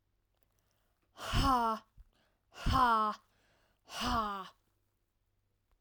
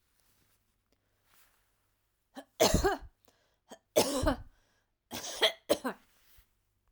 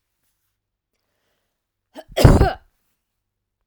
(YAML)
exhalation_length: 5.8 s
exhalation_amplitude: 4445
exhalation_signal_mean_std_ratio: 0.42
three_cough_length: 6.9 s
three_cough_amplitude: 9382
three_cough_signal_mean_std_ratio: 0.31
cough_length: 3.7 s
cough_amplitude: 32768
cough_signal_mean_std_ratio: 0.23
survey_phase: alpha (2021-03-01 to 2021-08-12)
age: 18-44
gender: Female
wearing_mask: 'No'
symptom_none: true
smoker_status: Never smoked
respiratory_condition_asthma: false
respiratory_condition_other: false
recruitment_source: REACT
submission_delay: 1 day
covid_test_result: Negative
covid_test_method: RT-qPCR